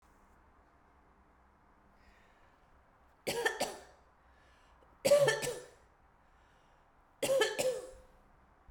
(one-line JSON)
{"three_cough_length": "8.7 s", "three_cough_amplitude": 6187, "three_cough_signal_mean_std_ratio": 0.34, "survey_phase": "beta (2021-08-13 to 2022-03-07)", "age": "18-44", "gender": "Female", "wearing_mask": "No", "symptom_cough_any": true, "symptom_runny_or_blocked_nose": true, "symptom_sore_throat": true, "symptom_fatigue": true, "symptom_change_to_sense_of_smell_or_taste": true, "symptom_loss_of_taste": true, "symptom_onset": "4 days", "smoker_status": "Never smoked", "respiratory_condition_asthma": false, "respiratory_condition_other": false, "recruitment_source": "Test and Trace", "submission_delay": "2 days", "covid_test_result": "Positive", "covid_test_method": "RT-qPCR", "covid_ct_value": 19.0, "covid_ct_gene": "ORF1ab gene", "covid_ct_mean": 19.5, "covid_viral_load": "400000 copies/ml", "covid_viral_load_category": "Low viral load (10K-1M copies/ml)"}